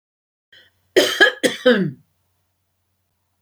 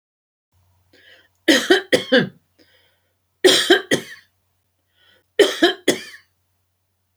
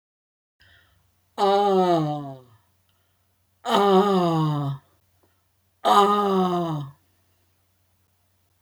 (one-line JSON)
{"cough_length": "3.4 s", "cough_amplitude": 31688, "cough_signal_mean_std_ratio": 0.34, "three_cough_length": "7.2 s", "three_cough_amplitude": 30112, "three_cough_signal_mean_std_ratio": 0.33, "exhalation_length": "8.6 s", "exhalation_amplitude": 22703, "exhalation_signal_mean_std_ratio": 0.5, "survey_phase": "beta (2021-08-13 to 2022-03-07)", "age": "65+", "gender": "Female", "wearing_mask": "No", "symptom_none": true, "smoker_status": "Never smoked", "respiratory_condition_asthma": false, "respiratory_condition_other": false, "recruitment_source": "REACT", "submission_delay": "2 days", "covid_test_result": "Negative", "covid_test_method": "RT-qPCR"}